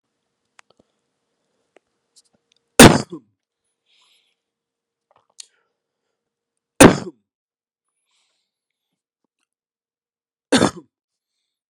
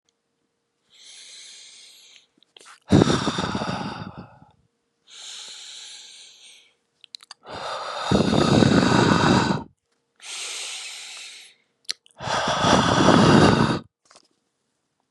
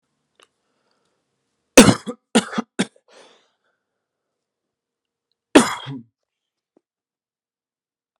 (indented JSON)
{
  "three_cough_length": "11.7 s",
  "three_cough_amplitude": 32768,
  "three_cough_signal_mean_std_ratio": 0.15,
  "exhalation_length": "15.1 s",
  "exhalation_amplitude": 32768,
  "exhalation_signal_mean_std_ratio": 0.45,
  "cough_length": "8.2 s",
  "cough_amplitude": 32768,
  "cough_signal_mean_std_ratio": 0.18,
  "survey_phase": "beta (2021-08-13 to 2022-03-07)",
  "age": "18-44",
  "gender": "Male",
  "wearing_mask": "No",
  "symptom_new_continuous_cough": true,
  "symptom_sore_throat": true,
  "symptom_onset": "6 days",
  "smoker_status": "Never smoked",
  "respiratory_condition_asthma": false,
  "respiratory_condition_other": false,
  "recruitment_source": "Test and Trace",
  "submission_delay": "1 day",
  "covid_test_result": "Positive",
  "covid_test_method": "ePCR"
}